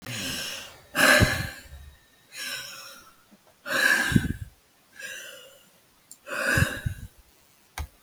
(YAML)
exhalation_length: 8.0 s
exhalation_amplitude: 18846
exhalation_signal_mean_std_ratio: 0.44
survey_phase: beta (2021-08-13 to 2022-03-07)
age: 18-44
gender: Female
wearing_mask: 'No'
symptom_none: true
smoker_status: Current smoker (1 to 10 cigarettes per day)
respiratory_condition_asthma: false
respiratory_condition_other: false
recruitment_source: REACT
submission_delay: 3 days
covid_test_result: Negative
covid_test_method: RT-qPCR
influenza_a_test_result: Negative
influenza_b_test_result: Negative